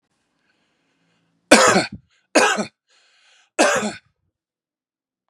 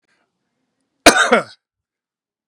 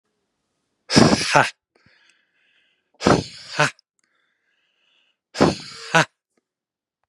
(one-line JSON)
{"three_cough_length": "5.3 s", "three_cough_amplitude": 32768, "three_cough_signal_mean_std_ratio": 0.32, "cough_length": "2.5 s", "cough_amplitude": 32768, "cough_signal_mean_std_ratio": 0.26, "exhalation_length": "7.1 s", "exhalation_amplitude": 32768, "exhalation_signal_mean_std_ratio": 0.3, "survey_phase": "beta (2021-08-13 to 2022-03-07)", "age": "45-64", "gender": "Male", "wearing_mask": "No", "symptom_runny_or_blocked_nose": true, "symptom_other": true, "symptom_onset": "8 days", "smoker_status": "Never smoked", "respiratory_condition_asthma": false, "respiratory_condition_other": false, "recruitment_source": "Test and Trace", "submission_delay": "2 days", "covid_test_result": "Negative", "covid_test_method": "RT-qPCR"}